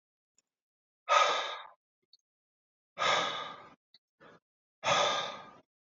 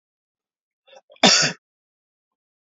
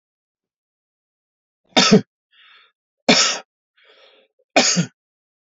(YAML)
exhalation_length: 5.8 s
exhalation_amplitude: 7768
exhalation_signal_mean_std_ratio: 0.4
cough_length: 2.6 s
cough_amplitude: 30444
cough_signal_mean_std_ratio: 0.25
three_cough_length: 5.5 s
three_cough_amplitude: 29013
three_cough_signal_mean_std_ratio: 0.29
survey_phase: alpha (2021-03-01 to 2021-08-12)
age: 45-64
gender: Male
wearing_mask: 'No'
symptom_none: true
smoker_status: Current smoker (1 to 10 cigarettes per day)
respiratory_condition_asthma: false
respiratory_condition_other: false
recruitment_source: REACT
submission_delay: 1 day
covid_test_result: Negative
covid_test_method: RT-qPCR